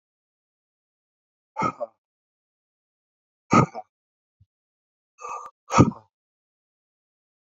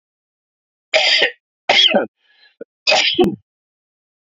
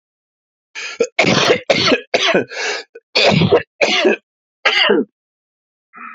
{"exhalation_length": "7.4 s", "exhalation_amplitude": 27097, "exhalation_signal_mean_std_ratio": 0.2, "three_cough_length": "4.3 s", "three_cough_amplitude": 29814, "three_cough_signal_mean_std_ratio": 0.44, "cough_length": "6.1 s", "cough_amplitude": 32767, "cough_signal_mean_std_ratio": 0.56, "survey_phase": "beta (2021-08-13 to 2022-03-07)", "age": "18-44", "gender": "Male", "wearing_mask": "No", "symptom_cough_any": true, "symptom_fever_high_temperature": true, "smoker_status": "Never smoked", "respiratory_condition_asthma": false, "respiratory_condition_other": false, "recruitment_source": "Test and Trace", "submission_delay": "1 day", "covid_test_result": "Positive", "covid_test_method": "LFT"}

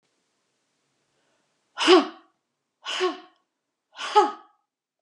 {"exhalation_length": "5.0 s", "exhalation_amplitude": 24771, "exhalation_signal_mean_std_ratio": 0.27, "survey_phase": "alpha (2021-03-01 to 2021-08-12)", "age": "65+", "gender": "Female", "wearing_mask": "No", "symptom_none": true, "smoker_status": "Ex-smoker", "respiratory_condition_asthma": false, "respiratory_condition_other": false, "recruitment_source": "REACT", "submission_delay": "1 day", "covid_test_result": "Negative", "covid_test_method": "RT-qPCR"}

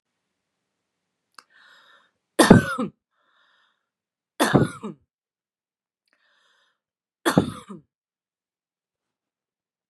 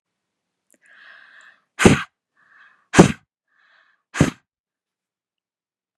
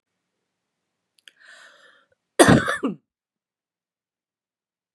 {"three_cough_length": "9.9 s", "three_cough_amplitude": 32768, "three_cough_signal_mean_std_ratio": 0.2, "exhalation_length": "6.0 s", "exhalation_amplitude": 32768, "exhalation_signal_mean_std_ratio": 0.2, "cough_length": "4.9 s", "cough_amplitude": 32767, "cough_signal_mean_std_ratio": 0.21, "survey_phase": "beta (2021-08-13 to 2022-03-07)", "age": "45-64", "gender": "Female", "wearing_mask": "No", "symptom_none": true, "symptom_onset": "12 days", "smoker_status": "Never smoked", "respiratory_condition_asthma": false, "respiratory_condition_other": false, "recruitment_source": "REACT", "submission_delay": "3 days", "covid_test_result": "Negative", "covid_test_method": "RT-qPCR", "influenza_a_test_result": "Negative", "influenza_b_test_result": "Negative"}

